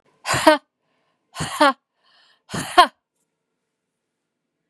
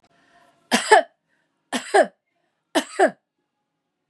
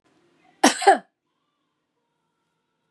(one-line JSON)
{"exhalation_length": "4.7 s", "exhalation_amplitude": 32767, "exhalation_signal_mean_std_ratio": 0.27, "three_cough_length": "4.1 s", "three_cough_amplitude": 32472, "three_cough_signal_mean_std_ratio": 0.3, "cough_length": "2.9 s", "cough_amplitude": 27912, "cough_signal_mean_std_ratio": 0.22, "survey_phase": "beta (2021-08-13 to 2022-03-07)", "age": "45-64", "gender": "Female", "wearing_mask": "No", "symptom_none": true, "smoker_status": "Ex-smoker", "respiratory_condition_asthma": false, "respiratory_condition_other": false, "recruitment_source": "REACT", "submission_delay": "1 day", "covid_test_result": "Negative", "covid_test_method": "RT-qPCR", "influenza_a_test_result": "Negative", "influenza_b_test_result": "Negative"}